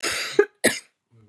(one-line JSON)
{"cough_length": "1.3 s", "cough_amplitude": 24016, "cough_signal_mean_std_ratio": 0.41, "survey_phase": "beta (2021-08-13 to 2022-03-07)", "age": "18-44", "gender": "Female", "wearing_mask": "No", "symptom_cough_any": true, "symptom_new_continuous_cough": true, "symptom_runny_or_blocked_nose": true, "symptom_shortness_of_breath": true, "symptom_sore_throat": true, "symptom_fatigue": true, "symptom_fever_high_temperature": true, "symptom_headache": true, "symptom_change_to_sense_of_smell_or_taste": true, "symptom_loss_of_taste": true, "symptom_onset": "5 days", "smoker_status": "Never smoked", "respiratory_condition_asthma": false, "respiratory_condition_other": false, "recruitment_source": "Test and Trace", "submission_delay": "2 days", "covid_test_result": "Positive", "covid_test_method": "RT-qPCR", "covid_ct_value": 23.1, "covid_ct_gene": "ORF1ab gene"}